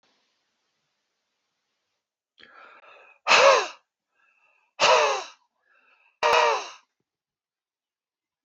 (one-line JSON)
{"exhalation_length": "8.4 s", "exhalation_amplitude": 20878, "exhalation_signal_mean_std_ratio": 0.3, "survey_phase": "beta (2021-08-13 to 2022-03-07)", "age": "65+", "gender": "Male", "wearing_mask": "No", "symptom_none": true, "smoker_status": "Never smoked", "respiratory_condition_asthma": false, "respiratory_condition_other": false, "recruitment_source": "REACT", "submission_delay": "3 days", "covid_test_result": "Negative", "covid_test_method": "RT-qPCR", "influenza_a_test_result": "Negative", "influenza_b_test_result": "Negative"}